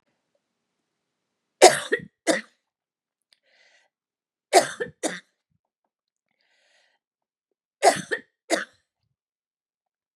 {"three_cough_length": "10.2 s", "three_cough_amplitude": 32768, "three_cough_signal_mean_std_ratio": 0.2, "survey_phase": "beta (2021-08-13 to 2022-03-07)", "age": "65+", "gender": "Female", "wearing_mask": "No", "symptom_cough_any": true, "smoker_status": "Ex-smoker", "respiratory_condition_asthma": false, "respiratory_condition_other": false, "recruitment_source": "REACT", "submission_delay": "2 days", "covid_test_result": "Negative", "covid_test_method": "RT-qPCR", "influenza_a_test_result": "Negative", "influenza_b_test_result": "Negative"}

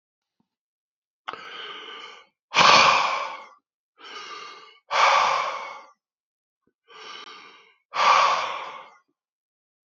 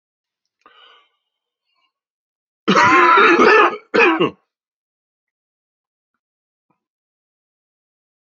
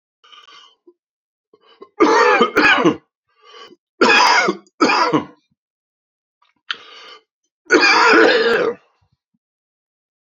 {"exhalation_length": "9.9 s", "exhalation_amplitude": 32768, "exhalation_signal_mean_std_ratio": 0.39, "cough_length": "8.4 s", "cough_amplitude": 29846, "cough_signal_mean_std_ratio": 0.34, "three_cough_length": "10.3 s", "three_cough_amplitude": 30218, "three_cough_signal_mean_std_ratio": 0.45, "survey_phase": "beta (2021-08-13 to 2022-03-07)", "age": "65+", "gender": "Male", "wearing_mask": "No", "symptom_cough_any": true, "symptom_runny_or_blocked_nose": true, "symptom_sore_throat": true, "smoker_status": "Ex-smoker", "respiratory_condition_asthma": false, "respiratory_condition_other": false, "recruitment_source": "Test and Trace", "submission_delay": "2 days", "covid_test_result": "Positive", "covid_test_method": "LFT"}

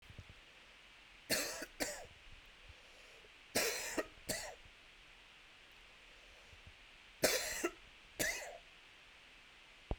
{"three_cough_length": "10.0 s", "three_cough_amplitude": 4295, "three_cough_signal_mean_std_ratio": 0.46, "survey_phase": "alpha (2021-03-01 to 2021-08-12)", "age": "18-44", "gender": "Male", "wearing_mask": "No", "symptom_cough_any": true, "symptom_fatigue": true, "symptom_fever_high_temperature": true, "symptom_headache": true, "symptom_onset": "2 days", "smoker_status": "Never smoked", "respiratory_condition_asthma": false, "respiratory_condition_other": false, "recruitment_source": "Test and Trace", "submission_delay": "1 day", "covid_test_result": "Positive", "covid_test_method": "RT-qPCR"}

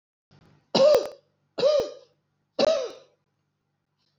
{"three_cough_length": "4.2 s", "three_cough_amplitude": 14670, "three_cough_signal_mean_std_ratio": 0.39, "survey_phase": "beta (2021-08-13 to 2022-03-07)", "age": "65+", "gender": "Female", "wearing_mask": "No", "symptom_none": true, "smoker_status": "Never smoked", "respiratory_condition_asthma": false, "respiratory_condition_other": false, "recruitment_source": "REACT", "submission_delay": "2 days", "covid_test_result": "Negative", "covid_test_method": "RT-qPCR", "influenza_a_test_result": "Negative", "influenza_b_test_result": "Negative"}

